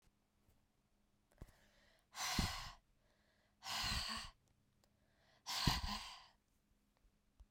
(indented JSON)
{
  "exhalation_length": "7.5 s",
  "exhalation_amplitude": 3594,
  "exhalation_signal_mean_std_ratio": 0.39,
  "survey_phase": "beta (2021-08-13 to 2022-03-07)",
  "age": "45-64",
  "gender": "Female",
  "wearing_mask": "No",
  "symptom_cough_any": true,
  "symptom_runny_or_blocked_nose": true,
  "symptom_headache": true,
  "symptom_other": true,
  "symptom_onset": "6 days",
  "smoker_status": "Never smoked",
  "respiratory_condition_asthma": false,
  "respiratory_condition_other": false,
  "recruitment_source": "Test and Trace",
  "submission_delay": "3 days",
  "covid_test_result": "Positive",
  "covid_test_method": "RT-qPCR"
}